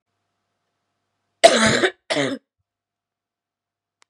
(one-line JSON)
{"cough_length": "4.1 s", "cough_amplitude": 32768, "cough_signal_mean_std_ratio": 0.28, "survey_phase": "beta (2021-08-13 to 2022-03-07)", "age": "18-44", "gender": "Female", "wearing_mask": "No", "symptom_cough_any": true, "symptom_new_continuous_cough": true, "symptom_runny_or_blocked_nose": true, "symptom_shortness_of_breath": true, "symptom_headache": true, "symptom_change_to_sense_of_smell_or_taste": true, "symptom_onset": "4 days", "smoker_status": "Never smoked", "respiratory_condition_asthma": false, "respiratory_condition_other": false, "recruitment_source": "Test and Trace", "submission_delay": "2 days", "covid_test_result": "Positive", "covid_test_method": "ePCR"}